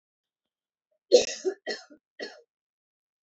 {"cough_length": "3.2 s", "cough_amplitude": 17055, "cough_signal_mean_std_ratio": 0.22, "survey_phase": "alpha (2021-03-01 to 2021-08-12)", "age": "18-44", "gender": "Female", "wearing_mask": "No", "symptom_none": true, "smoker_status": "Never smoked", "respiratory_condition_asthma": false, "respiratory_condition_other": false, "recruitment_source": "REACT", "submission_delay": "1 day", "covid_test_result": "Negative", "covid_test_method": "RT-qPCR"}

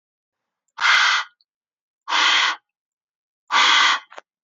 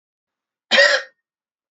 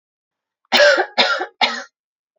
{"exhalation_length": "4.4 s", "exhalation_amplitude": 23546, "exhalation_signal_mean_std_ratio": 0.48, "cough_length": "1.7 s", "cough_amplitude": 28789, "cough_signal_mean_std_ratio": 0.33, "three_cough_length": "2.4 s", "three_cough_amplitude": 28987, "three_cough_signal_mean_std_ratio": 0.44, "survey_phase": "beta (2021-08-13 to 2022-03-07)", "age": "18-44", "gender": "Female", "wearing_mask": "No", "symptom_none": true, "smoker_status": "Ex-smoker", "respiratory_condition_asthma": false, "respiratory_condition_other": false, "recruitment_source": "REACT", "submission_delay": "5 days", "covid_test_result": "Negative", "covid_test_method": "RT-qPCR"}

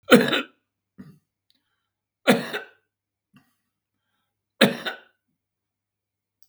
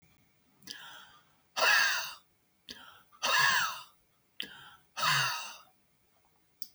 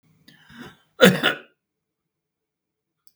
{"three_cough_length": "6.5 s", "three_cough_amplitude": 32768, "three_cough_signal_mean_std_ratio": 0.23, "exhalation_length": "6.7 s", "exhalation_amplitude": 7094, "exhalation_signal_mean_std_ratio": 0.42, "cough_length": "3.2 s", "cough_amplitude": 32768, "cough_signal_mean_std_ratio": 0.22, "survey_phase": "beta (2021-08-13 to 2022-03-07)", "age": "65+", "gender": "Male", "wearing_mask": "No", "symptom_none": true, "smoker_status": "Ex-smoker", "respiratory_condition_asthma": true, "respiratory_condition_other": true, "recruitment_source": "REACT", "submission_delay": "2 days", "covid_test_result": "Negative", "covid_test_method": "RT-qPCR", "influenza_a_test_result": "Negative", "influenza_b_test_result": "Negative"}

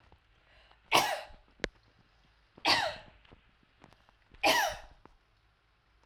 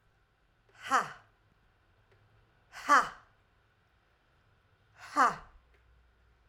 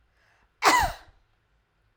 {"three_cough_length": "6.1 s", "three_cough_amplitude": 14752, "three_cough_signal_mean_std_ratio": 0.32, "exhalation_length": "6.5 s", "exhalation_amplitude": 10202, "exhalation_signal_mean_std_ratio": 0.24, "cough_length": "2.0 s", "cough_amplitude": 21147, "cough_signal_mean_std_ratio": 0.31, "survey_phase": "alpha (2021-03-01 to 2021-08-12)", "age": "45-64", "gender": "Female", "wearing_mask": "No", "symptom_none": true, "smoker_status": "Never smoked", "respiratory_condition_asthma": false, "respiratory_condition_other": false, "recruitment_source": "REACT", "submission_delay": "2 days", "covid_test_result": "Negative", "covid_test_method": "RT-qPCR"}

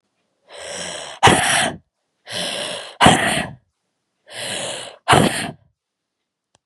{"exhalation_length": "6.7 s", "exhalation_amplitude": 32768, "exhalation_signal_mean_std_ratio": 0.43, "survey_phase": "beta (2021-08-13 to 2022-03-07)", "age": "18-44", "gender": "Female", "wearing_mask": "No", "symptom_cough_any": true, "symptom_runny_or_blocked_nose": true, "symptom_shortness_of_breath": true, "symptom_sore_throat": true, "symptom_fatigue": true, "symptom_headache": true, "symptom_change_to_sense_of_smell_or_taste": true, "symptom_onset": "3 days", "smoker_status": "Never smoked", "respiratory_condition_asthma": false, "respiratory_condition_other": false, "recruitment_source": "Test and Trace", "submission_delay": "2 days", "covid_test_result": "Positive", "covid_test_method": "RT-qPCR", "covid_ct_value": 22.4, "covid_ct_gene": "N gene"}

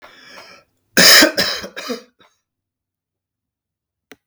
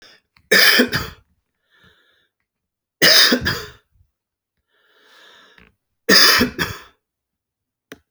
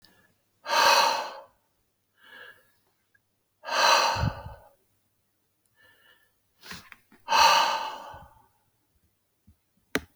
{"cough_length": "4.3 s", "cough_amplitude": 32768, "cough_signal_mean_std_ratio": 0.3, "three_cough_length": "8.1 s", "three_cough_amplitude": 32768, "three_cough_signal_mean_std_ratio": 0.34, "exhalation_length": "10.2 s", "exhalation_amplitude": 16303, "exhalation_signal_mean_std_ratio": 0.36, "survey_phase": "alpha (2021-03-01 to 2021-08-12)", "age": "65+", "gender": "Male", "wearing_mask": "No", "symptom_none": true, "smoker_status": "Never smoked", "respiratory_condition_asthma": false, "respiratory_condition_other": false, "recruitment_source": "REACT", "submission_delay": "1 day", "covid_test_result": "Negative", "covid_test_method": "RT-qPCR"}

